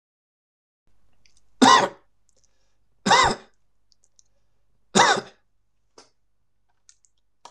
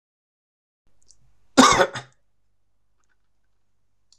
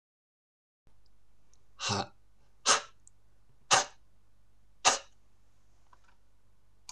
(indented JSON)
{
  "three_cough_length": "7.5 s",
  "three_cough_amplitude": 25069,
  "three_cough_signal_mean_std_ratio": 0.27,
  "cough_length": "4.2 s",
  "cough_amplitude": 26027,
  "cough_signal_mean_std_ratio": 0.22,
  "exhalation_length": "6.9 s",
  "exhalation_amplitude": 12344,
  "exhalation_signal_mean_std_ratio": 0.31,
  "survey_phase": "alpha (2021-03-01 to 2021-08-12)",
  "age": "18-44",
  "gender": "Male",
  "wearing_mask": "No",
  "symptom_none": true,
  "smoker_status": "Never smoked",
  "respiratory_condition_asthma": false,
  "respiratory_condition_other": false,
  "recruitment_source": "REACT",
  "submission_delay": "2 days",
  "covid_test_result": "Negative",
  "covid_test_method": "RT-qPCR"
}